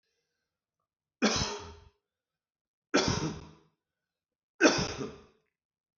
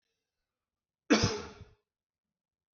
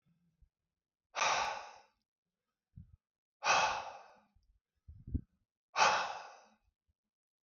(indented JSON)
{
  "three_cough_length": "6.0 s",
  "three_cough_amplitude": 13213,
  "three_cough_signal_mean_std_ratio": 0.32,
  "cough_length": "2.7 s",
  "cough_amplitude": 8306,
  "cough_signal_mean_std_ratio": 0.24,
  "exhalation_length": "7.4 s",
  "exhalation_amplitude": 5898,
  "exhalation_signal_mean_std_ratio": 0.34,
  "survey_phase": "beta (2021-08-13 to 2022-03-07)",
  "age": "45-64",
  "gender": "Male",
  "wearing_mask": "No",
  "symptom_cough_any": true,
  "symptom_fatigue": true,
  "symptom_headache": true,
  "symptom_other": true,
  "smoker_status": "Never smoked",
  "respiratory_condition_asthma": false,
  "respiratory_condition_other": false,
  "recruitment_source": "Test and Trace",
  "submission_delay": "2 days",
  "covid_test_result": "Positive",
  "covid_test_method": "LFT"
}